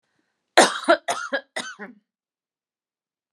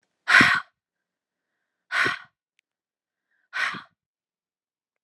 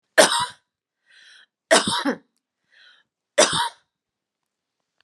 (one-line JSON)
{"cough_length": "3.3 s", "cough_amplitude": 32458, "cough_signal_mean_std_ratio": 0.28, "exhalation_length": "5.0 s", "exhalation_amplitude": 26184, "exhalation_signal_mean_std_ratio": 0.27, "three_cough_length": "5.0 s", "three_cough_amplitude": 28525, "three_cough_signal_mean_std_ratio": 0.31, "survey_phase": "alpha (2021-03-01 to 2021-08-12)", "age": "18-44", "gender": "Female", "wearing_mask": "No", "symptom_none": true, "smoker_status": "Never smoked", "respiratory_condition_asthma": false, "respiratory_condition_other": false, "recruitment_source": "REACT", "submission_delay": "1 day", "covid_test_result": "Negative", "covid_test_method": "RT-qPCR"}